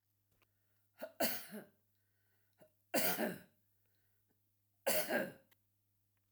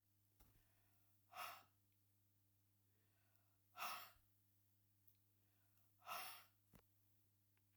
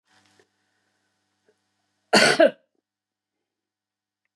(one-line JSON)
{"three_cough_length": "6.3 s", "three_cough_amplitude": 3232, "three_cough_signal_mean_std_ratio": 0.35, "exhalation_length": "7.8 s", "exhalation_amplitude": 448, "exhalation_signal_mean_std_ratio": 0.37, "cough_length": "4.4 s", "cough_amplitude": 21325, "cough_signal_mean_std_ratio": 0.22, "survey_phase": "alpha (2021-03-01 to 2021-08-12)", "age": "65+", "gender": "Female", "wearing_mask": "No", "symptom_none": true, "smoker_status": "Never smoked", "respiratory_condition_asthma": false, "respiratory_condition_other": true, "recruitment_source": "REACT", "submission_delay": "1 day", "covid_test_result": "Negative", "covid_test_method": "RT-qPCR"}